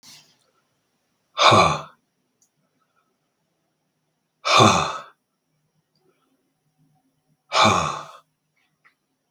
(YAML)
exhalation_length: 9.3 s
exhalation_amplitude: 32768
exhalation_signal_mean_std_ratio: 0.29
survey_phase: beta (2021-08-13 to 2022-03-07)
age: 45-64
gender: Male
wearing_mask: 'No'
symptom_none: true
smoker_status: Never smoked
respiratory_condition_asthma: false
respiratory_condition_other: false
recruitment_source: REACT
submission_delay: 3 days
covid_test_result: Negative
covid_test_method: RT-qPCR
influenza_a_test_result: Unknown/Void
influenza_b_test_result: Unknown/Void